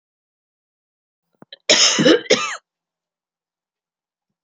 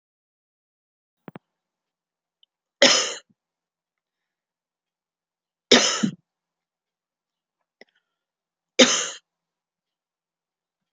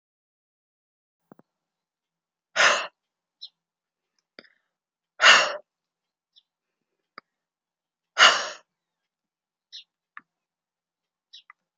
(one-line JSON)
{"cough_length": "4.4 s", "cough_amplitude": 31845, "cough_signal_mean_std_ratio": 0.31, "three_cough_length": "10.9 s", "three_cough_amplitude": 31866, "three_cough_signal_mean_std_ratio": 0.2, "exhalation_length": "11.8 s", "exhalation_amplitude": 28752, "exhalation_signal_mean_std_ratio": 0.2, "survey_phase": "alpha (2021-03-01 to 2021-08-12)", "age": "45-64", "gender": "Female", "wearing_mask": "No", "symptom_none": true, "smoker_status": "Never smoked", "respiratory_condition_asthma": false, "respiratory_condition_other": false, "recruitment_source": "REACT", "submission_delay": "2 days", "covid_test_result": "Negative", "covid_test_method": "RT-qPCR"}